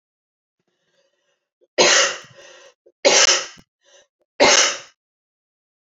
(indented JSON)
{
  "three_cough_length": "5.8 s",
  "three_cough_amplitude": 29895,
  "three_cough_signal_mean_std_ratio": 0.35,
  "survey_phase": "beta (2021-08-13 to 2022-03-07)",
  "age": "45-64",
  "gender": "Female",
  "wearing_mask": "No",
  "symptom_runny_or_blocked_nose": true,
  "symptom_sore_throat": true,
  "symptom_fatigue": true,
  "symptom_loss_of_taste": true,
  "smoker_status": "Never smoked",
  "respiratory_condition_asthma": false,
  "respiratory_condition_other": false,
  "recruitment_source": "Test and Trace",
  "submission_delay": "2 days",
  "covid_test_result": "Positive",
  "covid_test_method": "LFT"
}